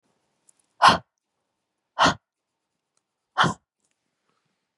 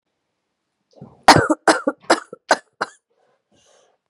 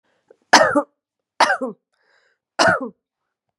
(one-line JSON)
{"exhalation_length": "4.8 s", "exhalation_amplitude": 28871, "exhalation_signal_mean_std_ratio": 0.23, "cough_length": "4.1 s", "cough_amplitude": 32768, "cough_signal_mean_std_ratio": 0.26, "three_cough_length": "3.6 s", "three_cough_amplitude": 32768, "three_cough_signal_mean_std_ratio": 0.34, "survey_phase": "beta (2021-08-13 to 2022-03-07)", "age": "18-44", "gender": "Female", "wearing_mask": "No", "symptom_cough_any": true, "symptom_diarrhoea": true, "symptom_fatigue": true, "symptom_headache": true, "symptom_change_to_sense_of_smell_or_taste": true, "symptom_loss_of_taste": true, "smoker_status": "Ex-smoker", "respiratory_condition_asthma": false, "respiratory_condition_other": false, "recruitment_source": "Test and Trace", "submission_delay": "3 days", "covid_test_result": "Positive", "covid_test_method": "RT-qPCR", "covid_ct_value": 25.9, "covid_ct_gene": "ORF1ab gene"}